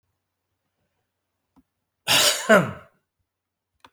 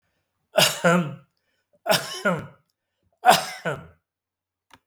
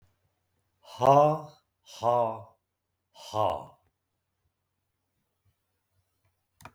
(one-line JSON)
{"cough_length": "3.9 s", "cough_amplitude": 26000, "cough_signal_mean_std_ratio": 0.28, "three_cough_length": "4.9 s", "three_cough_amplitude": 26705, "three_cough_signal_mean_std_ratio": 0.37, "exhalation_length": "6.7 s", "exhalation_amplitude": 14081, "exhalation_signal_mean_std_ratio": 0.28, "survey_phase": "beta (2021-08-13 to 2022-03-07)", "age": "65+", "gender": "Male", "wearing_mask": "No", "symptom_none": true, "symptom_onset": "4 days", "smoker_status": "Never smoked", "respiratory_condition_asthma": false, "respiratory_condition_other": false, "recruitment_source": "REACT", "submission_delay": "1 day", "covid_test_result": "Negative", "covid_test_method": "RT-qPCR", "influenza_a_test_result": "Negative", "influenza_b_test_result": "Negative"}